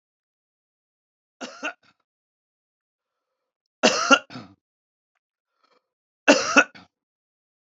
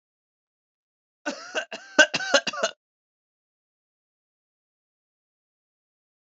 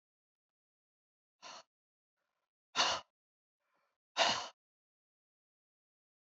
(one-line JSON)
{"three_cough_length": "7.7 s", "three_cough_amplitude": 30492, "three_cough_signal_mean_std_ratio": 0.21, "cough_length": "6.2 s", "cough_amplitude": 27245, "cough_signal_mean_std_ratio": 0.21, "exhalation_length": "6.2 s", "exhalation_amplitude": 4882, "exhalation_signal_mean_std_ratio": 0.22, "survey_phase": "beta (2021-08-13 to 2022-03-07)", "age": "45-64", "gender": "Male", "wearing_mask": "No", "symptom_none": true, "smoker_status": "Ex-smoker", "respiratory_condition_asthma": true, "respiratory_condition_other": false, "recruitment_source": "REACT", "submission_delay": "0 days", "covid_test_result": "Negative", "covid_test_method": "RT-qPCR", "influenza_a_test_result": "Negative", "influenza_b_test_result": "Negative"}